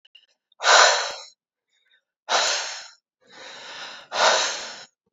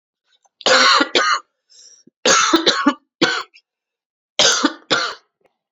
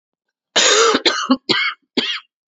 {
  "exhalation_length": "5.1 s",
  "exhalation_amplitude": 25501,
  "exhalation_signal_mean_std_ratio": 0.42,
  "three_cough_length": "5.7 s",
  "three_cough_amplitude": 32768,
  "three_cough_signal_mean_std_ratio": 0.48,
  "cough_length": "2.5 s",
  "cough_amplitude": 30897,
  "cough_signal_mean_std_ratio": 0.57,
  "survey_phase": "beta (2021-08-13 to 2022-03-07)",
  "age": "18-44",
  "gender": "Male",
  "wearing_mask": "No",
  "symptom_cough_any": true,
  "symptom_new_continuous_cough": true,
  "symptom_runny_or_blocked_nose": true,
  "symptom_shortness_of_breath": true,
  "symptom_sore_throat": true,
  "symptom_fatigue": true,
  "symptom_headache": true,
  "symptom_onset": "11 days",
  "smoker_status": "Never smoked",
  "respiratory_condition_asthma": false,
  "respiratory_condition_other": false,
  "recruitment_source": "Test and Trace",
  "submission_delay": "1 day",
  "covid_test_result": "Positive",
  "covid_test_method": "RT-qPCR",
  "covid_ct_value": 20.7,
  "covid_ct_gene": "ORF1ab gene",
  "covid_ct_mean": 21.7,
  "covid_viral_load": "79000 copies/ml",
  "covid_viral_load_category": "Low viral load (10K-1M copies/ml)"
}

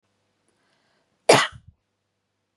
{
  "cough_length": "2.6 s",
  "cough_amplitude": 30285,
  "cough_signal_mean_std_ratio": 0.2,
  "survey_phase": "beta (2021-08-13 to 2022-03-07)",
  "age": "18-44",
  "gender": "Female",
  "wearing_mask": "No",
  "symptom_none": true,
  "smoker_status": "Ex-smoker",
  "respiratory_condition_asthma": false,
  "respiratory_condition_other": false,
  "recruitment_source": "REACT",
  "submission_delay": "6 days",
  "covid_test_result": "Negative",
  "covid_test_method": "RT-qPCR",
  "influenza_a_test_result": "Negative",
  "influenza_b_test_result": "Negative"
}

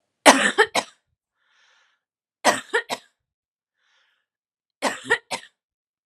{
  "three_cough_length": "6.1 s",
  "three_cough_amplitude": 32768,
  "three_cough_signal_mean_std_ratio": 0.26,
  "survey_phase": "alpha (2021-03-01 to 2021-08-12)",
  "age": "18-44",
  "gender": "Female",
  "wearing_mask": "No",
  "symptom_fatigue": true,
  "symptom_onset": "3 days",
  "smoker_status": "Never smoked",
  "respiratory_condition_asthma": false,
  "respiratory_condition_other": false,
  "recruitment_source": "Test and Trace",
  "submission_delay": "2 days",
  "covid_test_result": "Positive",
  "covid_test_method": "RT-qPCR",
  "covid_ct_value": 15.9,
  "covid_ct_gene": "N gene",
  "covid_ct_mean": 16.2,
  "covid_viral_load": "5000000 copies/ml",
  "covid_viral_load_category": "High viral load (>1M copies/ml)"
}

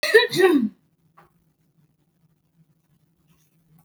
{
  "cough_length": "3.8 s",
  "cough_amplitude": 25088,
  "cough_signal_mean_std_ratio": 0.3,
  "survey_phase": "beta (2021-08-13 to 2022-03-07)",
  "age": "18-44",
  "gender": "Female",
  "wearing_mask": "No",
  "symptom_none": true,
  "smoker_status": "Never smoked",
  "respiratory_condition_asthma": false,
  "respiratory_condition_other": false,
  "recruitment_source": "Test and Trace",
  "submission_delay": "1 day",
  "covid_test_result": "Negative",
  "covid_test_method": "RT-qPCR"
}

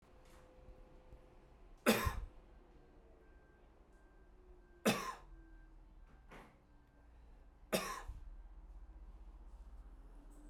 {
  "three_cough_length": "10.5 s",
  "three_cough_amplitude": 4371,
  "three_cough_signal_mean_std_ratio": 0.38,
  "survey_phase": "beta (2021-08-13 to 2022-03-07)",
  "age": "18-44",
  "gender": "Male",
  "wearing_mask": "Yes",
  "symptom_runny_or_blocked_nose": true,
  "symptom_onset": "2 days",
  "smoker_status": "Ex-smoker",
  "respiratory_condition_asthma": false,
  "respiratory_condition_other": false,
  "recruitment_source": "Test and Trace",
  "submission_delay": "1 day",
  "covid_test_result": "Positive",
  "covid_test_method": "RT-qPCR"
}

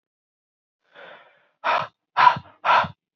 {
  "exhalation_length": "3.2 s",
  "exhalation_amplitude": 27204,
  "exhalation_signal_mean_std_ratio": 0.34,
  "survey_phase": "alpha (2021-03-01 to 2021-08-12)",
  "age": "18-44",
  "gender": "Male",
  "wearing_mask": "No",
  "symptom_cough_any": true,
  "symptom_fatigue": true,
  "symptom_headache": true,
  "symptom_onset": "3 days",
  "smoker_status": "Never smoked",
  "respiratory_condition_asthma": true,
  "respiratory_condition_other": false,
  "recruitment_source": "Test and Trace",
  "submission_delay": "1 day",
  "covid_test_result": "Positive",
  "covid_test_method": "RT-qPCR",
  "covid_ct_value": 24.5,
  "covid_ct_gene": "ORF1ab gene"
}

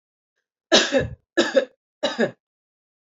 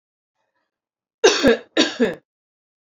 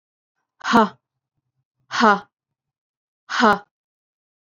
{
  "three_cough_length": "3.2 s",
  "three_cough_amplitude": 26444,
  "three_cough_signal_mean_std_ratio": 0.37,
  "cough_length": "3.0 s",
  "cough_amplitude": 32768,
  "cough_signal_mean_std_ratio": 0.34,
  "exhalation_length": "4.4 s",
  "exhalation_amplitude": 27956,
  "exhalation_signal_mean_std_ratio": 0.29,
  "survey_phase": "alpha (2021-03-01 to 2021-08-12)",
  "age": "45-64",
  "gender": "Female",
  "wearing_mask": "No",
  "symptom_none": true,
  "smoker_status": "Never smoked",
  "respiratory_condition_asthma": false,
  "respiratory_condition_other": false,
  "recruitment_source": "REACT",
  "submission_delay": "2 days",
  "covid_test_result": "Negative",
  "covid_test_method": "RT-qPCR"
}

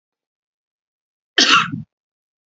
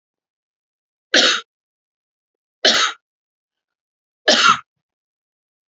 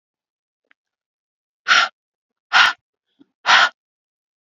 {
  "cough_length": "2.5 s",
  "cough_amplitude": 32411,
  "cough_signal_mean_std_ratio": 0.29,
  "three_cough_length": "5.7 s",
  "three_cough_amplitude": 32768,
  "three_cough_signal_mean_std_ratio": 0.29,
  "exhalation_length": "4.4 s",
  "exhalation_amplitude": 32767,
  "exhalation_signal_mean_std_ratio": 0.29,
  "survey_phase": "beta (2021-08-13 to 2022-03-07)",
  "age": "18-44",
  "gender": "Female",
  "wearing_mask": "No",
  "symptom_none": true,
  "smoker_status": "Current smoker (11 or more cigarettes per day)",
  "respiratory_condition_asthma": false,
  "respiratory_condition_other": false,
  "recruitment_source": "REACT",
  "submission_delay": "1 day",
  "covid_test_result": "Negative",
  "covid_test_method": "RT-qPCR",
  "influenza_a_test_result": "Negative",
  "influenza_b_test_result": "Negative"
}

